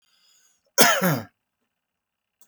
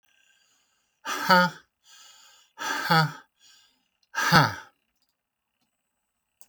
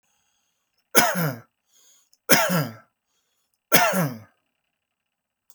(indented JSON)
{
  "cough_length": "2.5 s",
  "cough_amplitude": 32767,
  "cough_signal_mean_std_ratio": 0.31,
  "exhalation_length": "6.5 s",
  "exhalation_amplitude": 19067,
  "exhalation_signal_mean_std_ratio": 0.32,
  "three_cough_length": "5.5 s",
  "three_cough_amplitude": 32768,
  "three_cough_signal_mean_std_ratio": 0.35,
  "survey_phase": "beta (2021-08-13 to 2022-03-07)",
  "age": "65+",
  "gender": "Male",
  "wearing_mask": "No",
  "symptom_none": true,
  "smoker_status": "Ex-smoker",
  "respiratory_condition_asthma": false,
  "respiratory_condition_other": false,
  "recruitment_source": "REACT",
  "submission_delay": "1 day",
  "covid_test_result": "Negative",
  "covid_test_method": "RT-qPCR"
}